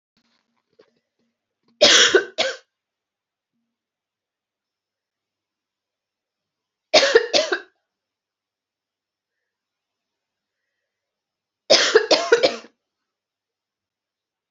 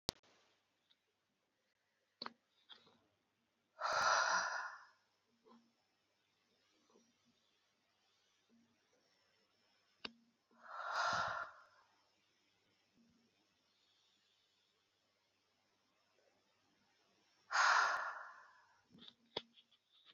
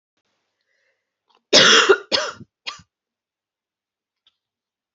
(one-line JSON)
{"three_cough_length": "14.5 s", "three_cough_amplitude": 32768, "three_cough_signal_mean_std_ratio": 0.25, "exhalation_length": "20.1 s", "exhalation_amplitude": 5683, "exhalation_signal_mean_std_ratio": 0.28, "cough_length": "4.9 s", "cough_amplitude": 32768, "cough_signal_mean_std_ratio": 0.27, "survey_phase": "beta (2021-08-13 to 2022-03-07)", "age": "18-44", "gender": "Female", "wearing_mask": "No", "symptom_cough_any": true, "symptom_runny_or_blocked_nose": true, "symptom_shortness_of_breath": true, "symptom_sore_throat": true, "symptom_diarrhoea": true, "symptom_fatigue": true, "symptom_headache": true, "symptom_change_to_sense_of_smell_or_taste": true, "symptom_onset": "8 days", "smoker_status": "Ex-smoker", "respiratory_condition_asthma": false, "respiratory_condition_other": false, "recruitment_source": "Test and Trace", "submission_delay": "2 days", "covid_test_result": "Positive", "covid_test_method": "RT-qPCR", "covid_ct_value": 15.7, "covid_ct_gene": "ORF1ab gene", "covid_ct_mean": 16.7, "covid_viral_load": "3200000 copies/ml", "covid_viral_load_category": "High viral load (>1M copies/ml)"}